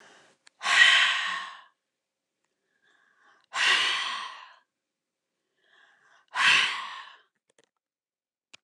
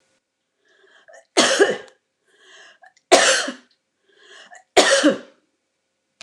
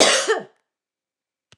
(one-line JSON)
{"exhalation_length": "8.6 s", "exhalation_amplitude": 19794, "exhalation_signal_mean_std_ratio": 0.37, "three_cough_length": "6.2 s", "three_cough_amplitude": 29204, "three_cough_signal_mean_std_ratio": 0.34, "cough_length": "1.6 s", "cough_amplitude": 29203, "cough_signal_mean_std_ratio": 0.39, "survey_phase": "beta (2021-08-13 to 2022-03-07)", "age": "65+", "gender": "Female", "wearing_mask": "No", "symptom_none": true, "smoker_status": "Never smoked", "respiratory_condition_asthma": false, "respiratory_condition_other": false, "recruitment_source": "REACT", "submission_delay": "2 days", "covid_test_result": "Negative", "covid_test_method": "RT-qPCR", "influenza_a_test_result": "Negative", "influenza_b_test_result": "Negative"}